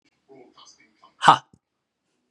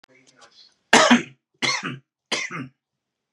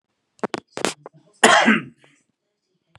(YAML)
exhalation_length: 2.3 s
exhalation_amplitude: 32768
exhalation_signal_mean_std_ratio: 0.17
three_cough_length: 3.3 s
three_cough_amplitude: 32767
three_cough_signal_mean_std_ratio: 0.34
cough_length: 3.0 s
cough_amplitude: 32768
cough_signal_mean_std_ratio: 0.31
survey_phase: beta (2021-08-13 to 2022-03-07)
age: 18-44
gender: Male
wearing_mask: 'No'
symptom_none: true
smoker_status: Never smoked
respiratory_condition_asthma: false
respiratory_condition_other: false
recruitment_source: REACT
submission_delay: 1 day
covid_test_result: Negative
covid_test_method: RT-qPCR
influenza_a_test_result: Negative
influenza_b_test_result: Negative